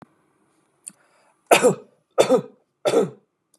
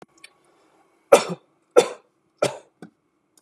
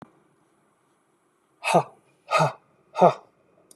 {
  "three_cough_length": "3.6 s",
  "three_cough_amplitude": 32244,
  "three_cough_signal_mean_std_ratio": 0.34,
  "cough_length": "3.4 s",
  "cough_amplitude": 32767,
  "cough_signal_mean_std_ratio": 0.21,
  "exhalation_length": "3.8 s",
  "exhalation_amplitude": 22511,
  "exhalation_signal_mean_std_ratio": 0.28,
  "survey_phase": "beta (2021-08-13 to 2022-03-07)",
  "age": "45-64",
  "gender": "Male",
  "wearing_mask": "No",
  "symptom_none": true,
  "smoker_status": "Ex-smoker",
  "respiratory_condition_asthma": false,
  "respiratory_condition_other": false,
  "recruitment_source": "REACT",
  "submission_delay": "3 days",
  "covid_test_result": "Negative",
  "covid_test_method": "RT-qPCR",
  "influenza_a_test_result": "Negative",
  "influenza_b_test_result": "Negative"
}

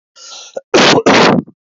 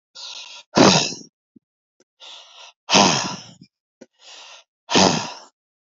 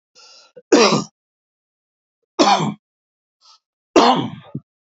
{
  "cough_length": "1.8 s",
  "cough_amplitude": 30528,
  "cough_signal_mean_std_ratio": 0.59,
  "exhalation_length": "5.8 s",
  "exhalation_amplitude": 31915,
  "exhalation_signal_mean_std_ratio": 0.36,
  "three_cough_length": "4.9 s",
  "three_cough_amplitude": 30396,
  "three_cough_signal_mean_std_ratio": 0.35,
  "survey_phase": "beta (2021-08-13 to 2022-03-07)",
  "age": "45-64",
  "gender": "Male",
  "wearing_mask": "No",
  "symptom_shortness_of_breath": true,
  "symptom_fatigue": true,
  "symptom_other": true,
  "symptom_onset": "12 days",
  "smoker_status": "Ex-smoker",
  "respiratory_condition_asthma": false,
  "respiratory_condition_other": true,
  "recruitment_source": "REACT",
  "submission_delay": "2 days",
  "covid_test_result": "Positive",
  "covid_test_method": "RT-qPCR",
  "covid_ct_value": 33.0,
  "covid_ct_gene": "E gene",
  "influenza_a_test_result": "Negative",
  "influenza_b_test_result": "Negative"
}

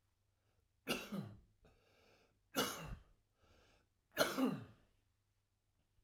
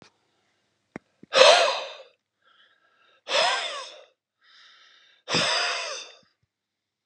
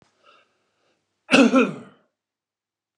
{
  "three_cough_length": "6.0 s",
  "three_cough_amplitude": 3793,
  "three_cough_signal_mean_std_ratio": 0.34,
  "exhalation_length": "7.1 s",
  "exhalation_amplitude": 32534,
  "exhalation_signal_mean_std_ratio": 0.35,
  "cough_length": "3.0 s",
  "cough_amplitude": 28926,
  "cough_signal_mean_std_ratio": 0.29,
  "survey_phase": "alpha (2021-03-01 to 2021-08-12)",
  "age": "45-64",
  "gender": "Male",
  "wearing_mask": "No",
  "symptom_none": true,
  "smoker_status": "Never smoked",
  "respiratory_condition_asthma": false,
  "respiratory_condition_other": false,
  "recruitment_source": "REACT",
  "submission_delay": "2 days",
  "covid_test_result": "Negative",
  "covid_test_method": "RT-qPCR"
}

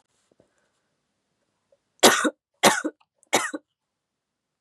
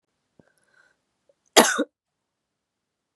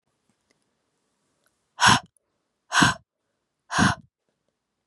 {
  "three_cough_length": "4.6 s",
  "three_cough_amplitude": 31399,
  "three_cough_signal_mean_std_ratio": 0.25,
  "cough_length": "3.2 s",
  "cough_amplitude": 32737,
  "cough_signal_mean_std_ratio": 0.19,
  "exhalation_length": "4.9 s",
  "exhalation_amplitude": 23885,
  "exhalation_signal_mean_std_ratio": 0.27,
  "survey_phase": "beta (2021-08-13 to 2022-03-07)",
  "age": "18-44",
  "gender": "Female",
  "wearing_mask": "No",
  "symptom_cough_any": true,
  "symptom_runny_or_blocked_nose": true,
  "symptom_sore_throat": true,
  "symptom_abdominal_pain": true,
  "symptom_fatigue": true,
  "symptom_headache": true,
  "symptom_onset": "2 days",
  "smoker_status": "Never smoked",
  "respiratory_condition_asthma": false,
  "respiratory_condition_other": false,
  "recruitment_source": "Test and Trace",
  "submission_delay": "1 day",
  "covid_test_result": "Positive",
  "covid_test_method": "ePCR"
}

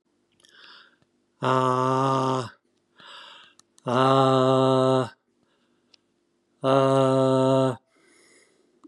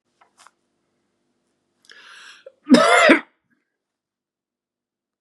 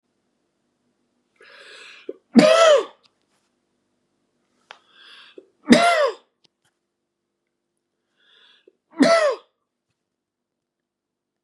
{
  "exhalation_length": "8.9 s",
  "exhalation_amplitude": 16521,
  "exhalation_signal_mean_std_ratio": 0.51,
  "cough_length": "5.2 s",
  "cough_amplitude": 32767,
  "cough_signal_mean_std_ratio": 0.25,
  "three_cough_length": "11.4 s",
  "three_cough_amplitude": 32768,
  "three_cough_signal_mean_std_ratio": 0.28,
  "survey_phase": "beta (2021-08-13 to 2022-03-07)",
  "age": "45-64",
  "gender": "Male",
  "wearing_mask": "No",
  "symptom_none": true,
  "smoker_status": "Never smoked",
  "respiratory_condition_asthma": false,
  "respiratory_condition_other": false,
  "recruitment_source": "REACT",
  "submission_delay": "2 days",
  "covid_test_result": "Negative",
  "covid_test_method": "RT-qPCR",
  "influenza_a_test_result": "Unknown/Void",
  "influenza_b_test_result": "Unknown/Void"
}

